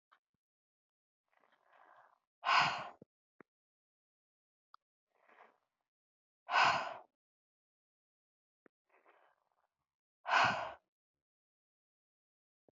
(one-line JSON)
{"exhalation_length": "12.7 s", "exhalation_amplitude": 4623, "exhalation_signal_mean_std_ratio": 0.23, "survey_phase": "beta (2021-08-13 to 2022-03-07)", "age": "45-64", "gender": "Female", "wearing_mask": "No", "symptom_none": true, "smoker_status": "Ex-smoker", "respiratory_condition_asthma": false, "respiratory_condition_other": false, "recruitment_source": "REACT", "submission_delay": "3 days", "covid_test_result": "Negative", "covid_test_method": "RT-qPCR"}